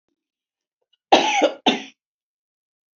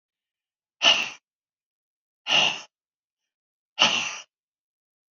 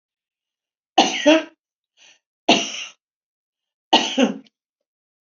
cough_length: 3.0 s
cough_amplitude: 31603
cough_signal_mean_std_ratio: 0.31
exhalation_length: 5.1 s
exhalation_amplitude: 22903
exhalation_signal_mean_std_ratio: 0.31
three_cough_length: 5.3 s
three_cough_amplitude: 30664
three_cough_signal_mean_std_ratio: 0.32
survey_phase: beta (2021-08-13 to 2022-03-07)
age: 65+
gender: Female
wearing_mask: 'No'
symptom_none: true
smoker_status: Never smoked
respiratory_condition_asthma: true
respiratory_condition_other: false
recruitment_source: REACT
submission_delay: 2 days
covid_test_result: Negative
covid_test_method: RT-qPCR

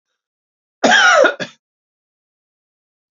cough_length: 3.2 s
cough_amplitude: 29217
cough_signal_mean_std_ratio: 0.34
survey_phase: beta (2021-08-13 to 2022-03-07)
age: 45-64
gender: Male
wearing_mask: 'No'
symptom_cough_any: true
symptom_new_continuous_cough: true
symptom_runny_or_blocked_nose: true
symptom_shortness_of_breath: true
symptom_sore_throat: true
symptom_fatigue: true
symptom_fever_high_temperature: true
symptom_headache: true
symptom_onset: 3 days
smoker_status: Ex-smoker
respiratory_condition_asthma: false
respiratory_condition_other: false
recruitment_source: Test and Trace
submission_delay: 2 days
covid_test_result: Positive
covid_test_method: RT-qPCR
covid_ct_value: 31.9
covid_ct_gene: N gene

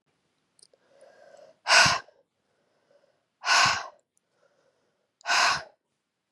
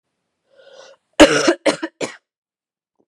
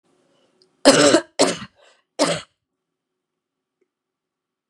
exhalation_length: 6.3 s
exhalation_amplitude: 19641
exhalation_signal_mean_std_ratio: 0.32
cough_length: 3.1 s
cough_amplitude: 32768
cough_signal_mean_std_ratio: 0.29
three_cough_length: 4.7 s
three_cough_amplitude: 32767
three_cough_signal_mean_std_ratio: 0.29
survey_phase: beta (2021-08-13 to 2022-03-07)
age: 18-44
gender: Female
wearing_mask: 'No'
symptom_cough_any: true
symptom_runny_or_blocked_nose: true
symptom_onset: 2 days
smoker_status: Never smoked
respiratory_condition_asthma: false
respiratory_condition_other: false
recruitment_source: REACT
submission_delay: 0 days
covid_test_result: Positive
covid_test_method: RT-qPCR
covid_ct_value: 24.0
covid_ct_gene: E gene
influenza_a_test_result: Negative
influenza_b_test_result: Negative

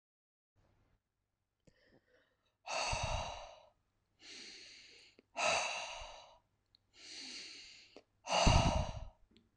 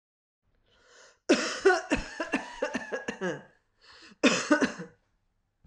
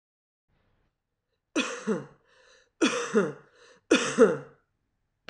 exhalation_length: 9.6 s
exhalation_amplitude: 5550
exhalation_signal_mean_std_ratio: 0.37
cough_length: 5.7 s
cough_amplitude: 14123
cough_signal_mean_std_ratio: 0.41
three_cough_length: 5.3 s
three_cough_amplitude: 15433
three_cough_signal_mean_std_ratio: 0.35
survey_phase: alpha (2021-03-01 to 2021-08-12)
age: 45-64
gender: Female
wearing_mask: 'No'
symptom_none: true
smoker_status: Never smoked
respiratory_condition_asthma: false
respiratory_condition_other: false
recruitment_source: REACT
submission_delay: 7 days
covid_test_result: Negative
covid_test_method: RT-qPCR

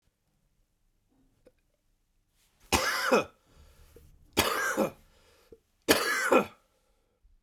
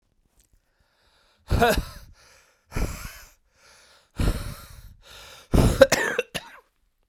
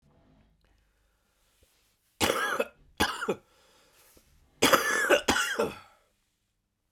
three_cough_length: 7.4 s
three_cough_amplitude: 23096
three_cough_signal_mean_std_ratio: 0.36
exhalation_length: 7.1 s
exhalation_amplitude: 32768
exhalation_signal_mean_std_ratio: 0.34
cough_length: 6.9 s
cough_amplitude: 15375
cough_signal_mean_std_ratio: 0.38
survey_phase: beta (2021-08-13 to 2022-03-07)
age: 18-44
gender: Male
wearing_mask: 'Yes'
symptom_cough_any: true
symptom_fatigue: true
symptom_fever_high_temperature: true
symptom_headache: true
symptom_other: true
symptom_onset: 4 days
smoker_status: Current smoker (e-cigarettes or vapes only)
respiratory_condition_asthma: false
respiratory_condition_other: false
recruitment_source: Test and Trace
submission_delay: 1 day
covid_test_result: Positive
covid_test_method: RT-qPCR
covid_ct_value: 23.2
covid_ct_gene: ORF1ab gene
covid_ct_mean: 23.4
covid_viral_load: 20000 copies/ml
covid_viral_load_category: Low viral load (10K-1M copies/ml)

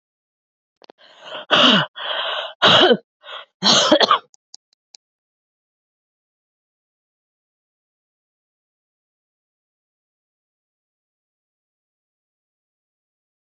exhalation_length: 13.5 s
exhalation_amplitude: 31476
exhalation_signal_mean_std_ratio: 0.27
survey_phase: alpha (2021-03-01 to 2021-08-12)
age: 45-64
gender: Female
wearing_mask: 'No'
symptom_cough_any: true
symptom_new_continuous_cough: true
symptom_shortness_of_breath: true
symptom_fatigue: true
symptom_fever_high_temperature: true
symptom_headache: true
symptom_change_to_sense_of_smell_or_taste: true
symptom_loss_of_taste: true
smoker_status: Never smoked
respiratory_condition_asthma: false
respiratory_condition_other: false
recruitment_source: Test and Trace
submission_delay: 2 days
covid_test_result: Positive
covid_test_method: LFT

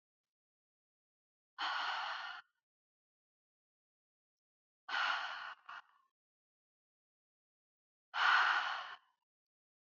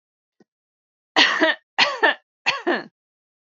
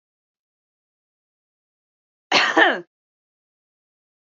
exhalation_length: 9.8 s
exhalation_amplitude: 3691
exhalation_signal_mean_std_ratio: 0.34
three_cough_length: 3.4 s
three_cough_amplitude: 29635
three_cough_signal_mean_std_ratio: 0.4
cough_length: 4.3 s
cough_amplitude: 29436
cough_signal_mean_std_ratio: 0.24
survey_phase: beta (2021-08-13 to 2022-03-07)
age: 18-44
gender: Female
wearing_mask: 'No'
symptom_none: true
smoker_status: Never smoked
respiratory_condition_asthma: false
respiratory_condition_other: false
recruitment_source: REACT
submission_delay: 1 day
covid_test_result: Negative
covid_test_method: RT-qPCR
influenza_a_test_result: Negative
influenza_b_test_result: Negative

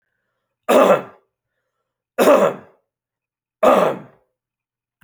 three_cough_length: 5.0 s
three_cough_amplitude: 30993
three_cough_signal_mean_std_ratio: 0.36
survey_phase: alpha (2021-03-01 to 2021-08-12)
age: 18-44
gender: Male
wearing_mask: 'No'
symptom_cough_any: true
smoker_status: Never smoked
respiratory_condition_asthma: false
respiratory_condition_other: false
recruitment_source: REACT
submission_delay: 1 day
covid_test_result: Negative
covid_test_method: RT-qPCR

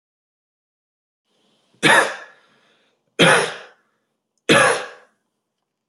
three_cough_length: 5.9 s
three_cough_amplitude: 29075
three_cough_signal_mean_std_ratio: 0.32
survey_phase: beta (2021-08-13 to 2022-03-07)
age: 18-44
gender: Male
wearing_mask: 'No'
symptom_none: true
smoker_status: Ex-smoker
respiratory_condition_asthma: false
respiratory_condition_other: false
recruitment_source: REACT
submission_delay: 2 days
covid_test_result: Negative
covid_test_method: RT-qPCR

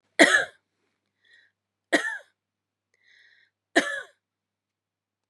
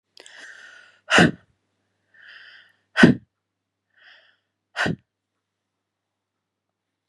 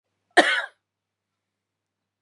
three_cough_length: 5.3 s
three_cough_amplitude: 31294
three_cough_signal_mean_std_ratio: 0.24
exhalation_length: 7.1 s
exhalation_amplitude: 32768
exhalation_signal_mean_std_ratio: 0.21
cough_length: 2.2 s
cough_amplitude: 28849
cough_signal_mean_std_ratio: 0.23
survey_phase: beta (2021-08-13 to 2022-03-07)
age: 45-64
gender: Female
wearing_mask: 'No'
symptom_cough_any: true
symptom_runny_or_blocked_nose: true
symptom_sore_throat: true
symptom_fatigue: true
symptom_headache: true
symptom_change_to_sense_of_smell_or_taste: true
symptom_other: true
symptom_onset: 4 days
smoker_status: Never smoked
respiratory_condition_asthma: false
respiratory_condition_other: false
recruitment_source: Test and Trace
submission_delay: 2 days
covid_test_result: Positive
covid_test_method: RT-qPCR
covid_ct_value: 28.6
covid_ct_gene: N gene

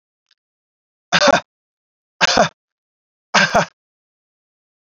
three_cough_length: 4.9 s
three_cough_amplitude: 32767
three_cough_signal_mean_std_ratio: 0.3
survey_phase: beta (2021-08-13 to 2022-03-07)
age: 18-44
gender: Male
wearing_mask: 'No'
symptom_none: true
smoker_status: Never smoked
respiratory_condition_asthma: false
respiratory_condition_other: false
recruitment_source: REACT
submission_delay: 2 days
covid_test_result: Negative
covid_test_method: RT-qPCR
influenza_a_test_result: Negative
influenza_b_test_result: Negative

